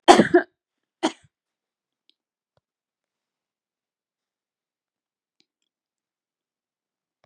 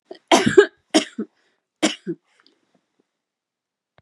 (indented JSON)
{
  "cough_length": "7.3 s",
  "cough_amplitude": 32768,
  "cough_signal_mean_std_ratio": 0.15,
  "three_cough_length": "4.0 s",
  "three_cough_amplitude": 32767,
  "three_cough_signal_mean_std_ratio": 0.26,
  "survey_phase": "beta (2021-08-13 to 2022-03-07)",
  "age": "65+",
  "gender": "Female",
  "wearing_mask": "Prefer not to say",
  "symptom_none": true,
  "smoker_status": "Prefer not to say",
  "respiratory_condition_asthma": false,
  "respiratory_condition_other": false,
  "recruitment_source": "REACT",
  "submission_delay": "4 days",
  "covid_test_result": "Negative",
  "covid_test_method": "RT-qPCR",
  "influenza_a_test_result": "Negative",
  "influenza_b_test_result": "Negative"
}